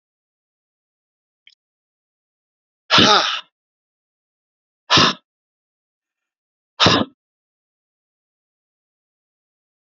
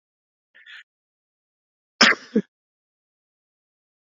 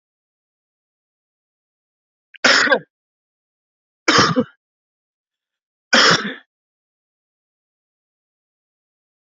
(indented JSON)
{
  "exhalation_length": "10.0 s",
  "exhalation_amplitude": 32767,
  "exhalation_signal_mean_std_ratio": 0.23,
  "cough_length": "4.1 s",
  "cough_amplitude": 29662,
  "cough_signal_mean_std_ratio": 0.17,
  "three_cough_length": "9.3 s",
  "three_cough_amplitude": 32203,
  "three_cough_signal_mean_std_ratio": 0.26,
  "survey_phase": "beta (2021-08-13 to 2022-03-07)",
  "age": "45-64",
  "gender": "Male",
  "wearing_mask": "No",
  "symptom_cough_any": true,
  "symptom_runny_or_blocked_nose": true,
  "symptom_sore_throat": true,
  "symptom_onset": "2 days",
  "smoker_status": "Ex-smoker",
  "respiratory_condition_asthma": false,
  "respiratory_condition_other": false,
  "recruitment_source": "Test and Trace",
  "submission_delay": "1 day",
  "covid_test_result": "Negative",
  "covid_test_method": "ePCR"
}